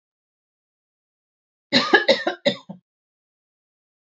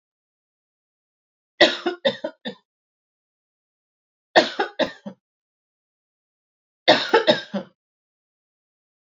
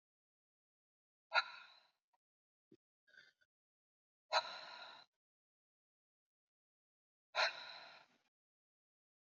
{"cough_length": "4.0 s", "cough_amplitude": 28359, "cough_signal_mean_std_ratio": 0.27, "three_cough_length": "9.1 s", "three_cough_amplitude": 32681, "three_cough_signal_mean_std_ratio": 0.25, "exhalation_length": "9.4 s", "exhalation_amplitude": 3792, "exhalation_signal_mean_std_ratio": 0.21, "survey_phase": "beta (2021-08-13 to 2022-03-07)", "age": "18-44", "gender": "Female", "wearing_mask": "No", "symptom_cough_any": true, "symptom_onset": "3 days", "smoker_status": "Never smoked", "respiratory_condition_asthma": false, "respiratory_condition_other": false, "recruitment_source": "Test and Trace", "submission_delay": "2 days", "covid_test_result": "Positive", "covid_test_method": "RT-qPCR", "covid_ct_value": 21.0, "covid_ct_gene": "ORF1ab gene", "covid_ct_mean": 21.1, "covid_viral_load": "120000 copies/ml", "covid_viral_load_category": "Low viral load (10K-1M copies/ml)"}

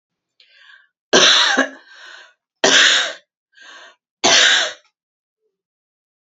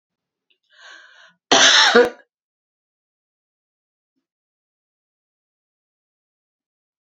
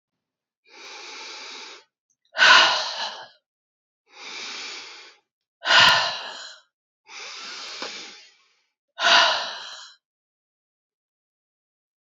{"three_cough_length": "6.4 s", "three_cough_amplitude": 32767, "three_cough_signal_mean_std_ratio": 0.4, "cough_length": "7.1 s", "cough_amplitude": 32767, "cough_signal_mean_std_ratio": 0.23, "exhalation_length": "12.0 s", "exhalation_amplitude": 27568, "exhalation_signal_mean_std_ratio": 0.33, "survey_phase": "alpha (2021-03-01 to 2021-08-12)", "age": "65+", "gender": "Female", "wearing_mask": "No", "symptom_none": true, "smoker_status": "Never smoked", "respiratory_condition_asthma": false, "respiratory_condition_other": false, "recruitment_source": "REACT", "submission_delay": "2 days", "covid_test_result": "Negative", "covid_test_method": "RT-qPCR"}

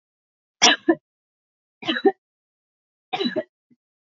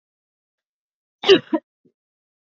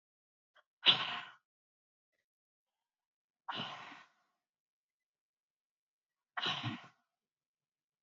{"three_cough_length": "4.2 s", "three_cough_amplitude": 30844, "three_cough_signal_mean_std_ratio": 0.27, "cough_length": "2.6 s", "cough_amplitude": 28803, "cough_signal_mean_std_ratio": 0.2, "exhalation_length": "8.0 s", "exhalation_amplitude": 9311, "exhalation_signal_mean_std_ratio": 0.22, "survey_phase": "beta (2021-08-13 to 2022-03-07)", "age": "18-44", "gender": "Female", "wearing_mask": "No", "symptom_cough_any": true, "symptom_runny_or_blocked_nose": true, "symptom_headache": true, "symptom_onset": "3 days", "smoker_status": "Never smoked", "respiratory_condition_asthma": false, "respiratory_condition_other": false, "recruitment_source": "Test and Trace", "submission_delay": "2 days", "covid_test_result": "Positive", "covid_test_method": "RT-qPCR"}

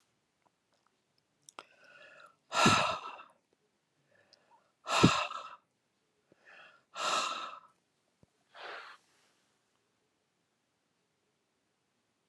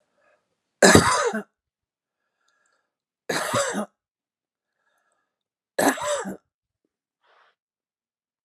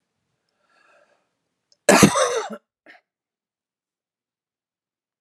{"exhalation_length": "12.3 s", "exhalation_amplitude": 14263, "exhalation_signal_mean_std_ratio": 0.27, "three_cough_length": "8.4 s", "three_cough_amplitude": 32768, "three_cough_signal_mean_std_ratio": 0.28, "cough_length": "5.2 s", "cough_amplitude": 32767, "cough_signal_mean_std_ratio": 0.23, "survey_phase": "alpha (2021-03-01 to 2021-08-12)", "age": "65+", "gender": "Female", "wearing_mask": "No", "symptom_none": true, "smoker_status": "Ex-smoker", "respiratory_condition_asthma": false, "respiratory_condition_other": false, "recruitment_source": "REACT", "submission_delay": "1 day", "covid_test_result": "Negative", "covid_test_method": "RT-qPCR"}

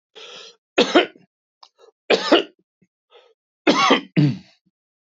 {"three_cough_length": "5.1 s", "three_cough_amplitude": 27151, "three_cough_signal_mean_std_ratio": 0.36, "survey_phase": "beta (2021-08-13 to 2022-03-07)", "age": "65+", "gender": "Male", "wearing_mask": "No", "symptom_none": true, "smoker_status": "Ex-smoker", "respiratory_condition_asthma": false, "respiratory_condition_other": false, "recruitment_source": "REACT", "submission_delay": "-1 day", "covid_test_result": "Negative", "covid_test_method": "RT-qPCR", "influenza_a_test_result": "Negative", "influenza_b_test_result": "Negative"}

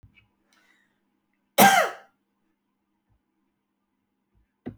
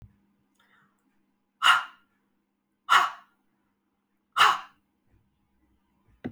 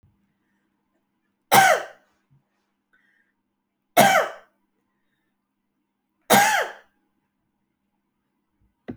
{"cough_length": "4.8 s", "cough_amplitude": 27910, "cough_signal_mean_std_ratio": 0.2, "exhalation_length": "6.3 s", "exhalation_amplitude": 17313, "exhalation_signal_mean_std_ratio": 0.25, "three_cough_length": "9.0 s", "three_cough_amplitude": 31833, "three_cough_signal_mean_std_ratio": 0.26, "survey_phase": "beta (2021-08-13 to 2022-03-07)", "age": "65+", "gender": "Female", "wearing_mask": "No", "symptom_none": true, "smoker_status": "Ex-smoker", "respiratory_condition_asthma": true, "respiratory_condition_other": true, "recruitment_source": "REACT", "submission_delay": "3 days", "covid_test_result": "Negative", "covid_test_method": "RT-qPCR"}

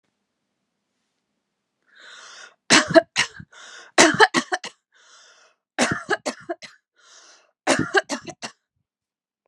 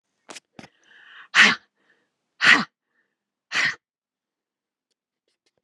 {"three_cough_length": "9.5 s", "three_cough_amplitude": 32765, "three_cough_signal_mean_std_ratio": 0.28, "exhalation_length": "5.6 s", "exhalation_amplitude": 31276, "exhalation_signal_mean_std_ratio": 0.25, "survey_phase": "beta (2021-08-13 to 2022-03-07)", "age": "45-64", "gender": "Female", "wearing_mask": "No", "symptom_none": true, "symptom_onset": "12 days", "smoker_status": "Never smoked", "respiratory_condition_asthma": true, "respiratory_condition_other": false, "recruitment_source": "REACT", "submission_delay": "2 days", "covid_test_result": "Negative", "covid_test_method": "RT-qPCR"}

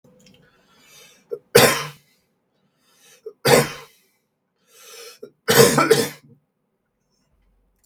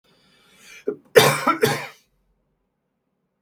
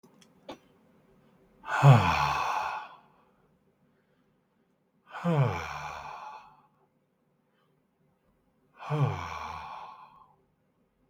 {"three_cough_length": "7.9 s", "three_cough_amplitude": 32768, "three_cough_signal_mean_std_ratio": 0.3, "cough_length": "3.4 s", "cough_amplitude": 32768, "cough_signal_mean_std_ratio": 0.3, "exhalation_length": "11.1 s", "exhalation_amplitude": 16545, "exhalation_signal_mean_std_ratio": 0.33, "survey_phase": "beta (2021-08-13 to 2022-03-07)", "age": "18-44", "gender": "Male", "wearing_mask": "No", "symptom_none": true, "smoker_status": "Never smoked", "respiratory_condition_asthma": false, "respiratory_condition_other": false, "recruitment_source": "REACT", "submission_delay": "1 day", "covid_test_result": "Negative", "covid_test_method": "RT-qPCR", "influenza_a_test_result": "Negative", "influenza_b_test_result": "Negative"}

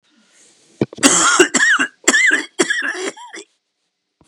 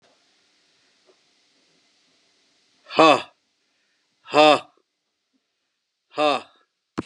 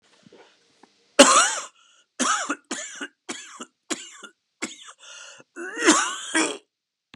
{"three_cough_length": "4.3 s", "three_cough_amplitude": 32768, "three_cough_signal_mean_std_ratio": 0.52, "exhalation_length": "7.1 s", "exhalation_amplitude": 28516, "exhalation_signal_mean_std_ratio": 0.24, "cough_length": "7.2 s", "cough_amplitude": 32768, "cough_signal_mean_std_ratio": 0.35, "survey_phase": "beta (2021-08-13 to 2022-03-07)", "age": "65+", "gender": "Male", "wearing_mask": "No", "symptom_cough_any": true, "symptom_runny_or_blocked_nose": true, "symptom_shortness_of_breath": true, "symptom_sore_throat": true, "symptom_abdominal_pain": true, "symptom_diarrhoea": true, "symptom_headache": true, "symptom_onset": "5 days", "smoker_status": "Ex-smoker", "respiratory_condition_asthma": false, "respiratory_condition_other": false, "recruitment_source": "Test and Trace", "submission_delay": "1 day", "covid_test_result": "Negative", "covid_test_method": "RT-qPCR"}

